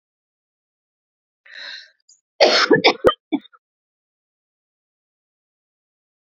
{"cough_length": "6.4 s", "cough_amplitude": 31678, "cough_signal_mean_std_ratio": 0.25, "survey_phase": "beta (2021-08-13 to 2022-03-07)", "age": "18-44", "gender": "Female", "wearing_mask": "No", "symptom_cough_any": true, "symptom_runny_or_blocked_nose": true, "symptom_headache": true, "smoker_status": "Never smoked", "respiratory_condition_asthma": false, "respiratory_condition_other": false, "recruitment_source": "Test and Trace", "submission_delay": "2 days", "covid_test_result": "Positive", "covid_test_method": "ePCR"}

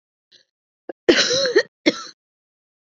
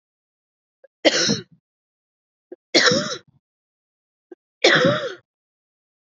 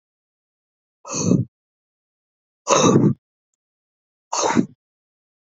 {"cough_length": "2.9 s", "cough_amplitude": 27217, "cough_signal_mean_std_ratio": 0.35, "three_cough_length": "6.1 s", "three_cough_amplitude": 28013, "three_cough_signal_mean_std_ratio": 0.33, "exhalation_length": "5.5 s", "exhalation_amplitude": 31021, "exhalation_signal_mean_std_ratio": 0.34, "survey_phase": "beta (2021-08-13 to 2022-03-07)", "age": "45-64", "gender": "Female", "wearing_mask": "No", "symptom_cough_any": true, "symptom_runny_or_blocked_nose": true, "symptom_sore_throat": true, "symptom_fatigue": true, "symptom_headache": true, "symptom_onset": "3 days", "smoker_status": "Ex-smoker", "respiratory_condition_asthma": false, "respiratory_condition_other": false, "recruitment_source": "Test and Trace", "submission_delay": "1 day", "covid_test_result": "Positive", "covid_test_method": "RT-qPCR", "covid_ct_value": 18.4, "covid_ct_gene": "N gene"}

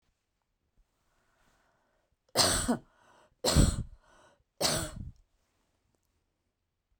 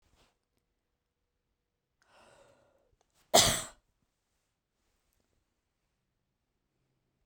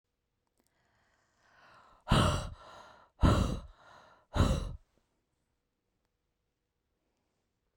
{"three_cough_length": "7.0 s", "three_cough_amplitude": 11565, "three_cough_signal_mean_std_ratio": 0.31, "cough_length": "7.3 s", "cough_amplitude": 13354, "cough_signal_mean_std_ratio": 0.15, "exhalation_length": "7.8 s", "exhalation_amplitude": 6973, "exhalation_signal_mean_std_ratio": 0.3, "survey_phase": "beta (2021-08-13 to 2022-03-07)", "age": "65+", "gender": "Female", "wearing_mask": "No", "symptom_none": true, "smoker_status": "Ex-smoker", "respiratory_condition_asthma": false, "respiratory_condition_other": false, "recruitment_source": "REACT", "submission_delay": "0 days", "covid_test_result": "Negative", "covid_test_method": "RT-qPCR"}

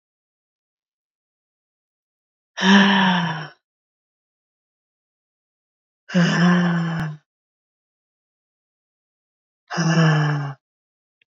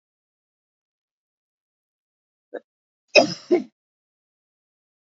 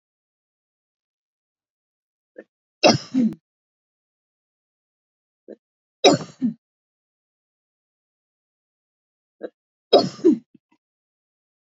{"exhalation_length": "11.3 s", "exhalation_amplitude": 26046, "exhalation_signal_mean_std_ratio": 0.4, "cough_length": "5.0 s", "cough_amplitude": 29092, "cough_signal_mean_std_ratio": 0.17, "three_cough_length": "11.7 s", "three_cough_amplitude": 29341, "three_cough_signal_mean_std_ratio": 0.2, "survey_phase": "beta (2021-08-13 to 2022-03-07)", "age": "45-64", "gender": "Female", "wearing_mask": "No", "symptom_cough_any": true, "symptom_change_to_sense_of_smell_or_taste": true, "symptom_loss_of_taste": true, "symptom_onset": "7 days", "smoker_status": "Ex-smoker", "respiratory_condition_asthma": false, "respiratory_condition_other": false, "recruitment_source": "Test and Trace", "submission_delay": "2 days", "covid_test_result": "Positive", "covid_test_method": "RT-qPCR"}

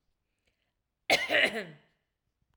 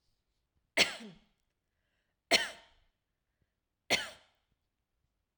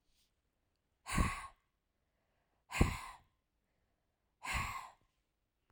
{"cough_length": "2.6 s", "cough_amplitude": 8622, "cough_signal_mean_std_ratio": 0.33, "three_cough_length": "5.4 s", "three_cough_amplitude": 9592, "three_cough_signal_mean_std_ratio": 0.22, "exhalation_length": "5.7 s", "exhalation_amplitude": 6020, "exhalation_signal_mean_std_ratio": 0.29, "survey_phase": "alpha (2021-03-01 to 2021-08-12)", "age": "45-64", "gender": "Female", "wearing_mask": "No", "symptom_none": true, "smoker_status": "Never smoked", "respiratory_condition_asthma": false, "respiratory_condition_other": false, "recruitment_source": "REACT", "submission_delay": "1 day", "covid_test_result": "Negative", "covid_test_method": "RT-qPCR"}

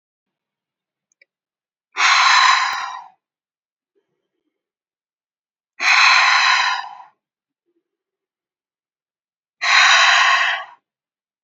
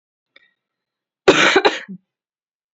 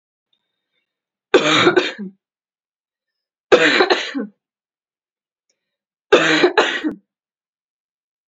{"exhalation_length": "11.4 s", "exhalation_amplitude": 29302, "exhalation_signal_mean_std_ratio": 0.42, "cough_length": "2.7 s", "cough_amplitude": 29550, "cough_signal_mean_std_ratio": 0.31, "three_cough_length": "8.3 s", "three_cough_amplitude": 32768, "three_cough_signal_mean_std_ratio": 0.36, "survey_phase": "beta (2021-08-13 to 2022-03-07)", "age": "18-44", "gender": "Female", "wearing_mask": "No", "symptom_none": true, "smoker_status": "Never smoked", "respiratory_condition_asthma": false, "respiratory_condition_other": false, "recruitment_source": "REACT", "submission_delay": "1 day", "covid_test_result": "Negative", "covid_test_method": "RT-qPCR", "influenza_a_test_result": "Negative", "influenza_b_test_result": "Negative"}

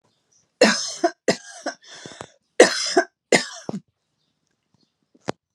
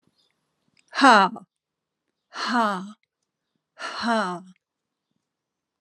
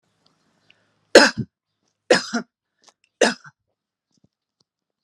{"cough_length": "5.5 s", "cough_amplitude": 32768, "cough_signal_mean_std_ratio": 0.3, "exhalation_length": "5.8 s", "exhalation_amplitude": 27505, "exhalation_signal_mean_std_ratio": 0.31, "three_cough_length": "5.0 s", "three_cough_amplitude": 32768, "three_cough_signal_mean_std_ratio": 0.21, "survey_phase": "alpha (2021-03-01 to 2021-08-12)", "age": "45-64", "gender": "Female", "wearing_mask": "No", "symptom_none": true, "smoker_status": "Never smoked", "respiratory_condition_asthma": false, "respiratory_condition_other": false, "recruitment_source": "REACT", "submission_delay": "2 days", "covid_test_result": "Negative", "covid_test_method": "RT-qPCR"}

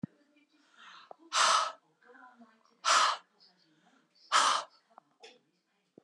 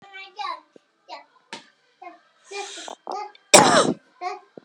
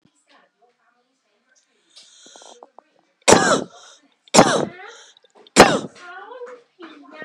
{"exhalation_length": "6.0 s", "exhalation_amplitude": 7690, "exhalation_signal_mean_std_ratio": 0.35, "cough_length": "4.6 s", "cough_amplitude": 32768, "cough_signal_mean_std_ratio": 0.3, "three_cough_length": "7.2 s", "three_cough_amplitude": 32768, "three_cough_signal_mean_std_ratio": 0.27, "survey_phase": "beta (2021-08-13 to 2022-03-07)", "age": "45-64", "gender": "Female", "wearing_mask": "No", "symptom_none": true, "smoker_status": "Ex-smoker", "respiratory_condition_asthma": false, "respiratory_condition_other": false, "recruitment_source": "REACT", "submission_delay": "4 days", "covid_test_result": "Negative", "covid_test_method": "RT-qPCR", "influenza_a_test_result": "Negative", "influenza_b_test_result": "Negative"}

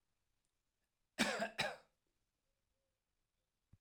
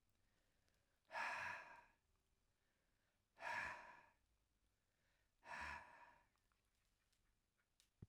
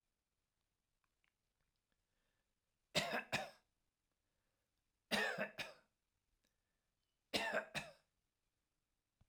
{"cough_length": "3.8 s", "cough_amplitude": 3286, "cough_signal_mean_std_ratio": 0.27, "exhalation_length": "8.1 s", "exhalation_amplitude": 691, "exhalation_signal_mean_std_ratio": 0.38, "three_cough_length": "9.3 s", "three_cough_amplitude": 2655, "three_cough_signal_mean_std_ratio": 0.29, "survey_phase": "alpha (2021-03-01 to 2021-08-12)", "age": "65+", "gender": "Male", "wearing_mask": "No", "symptom_none": true, "smoker_status": "Ex-smoker", "respiratory_condition_asthma": false, "respiratory_condition_other": false, "recruitment_source": "REACT", "submission_delay": "5 days", "covid_test_result": "Negative", "covid_test_method": "RT-qPCR"}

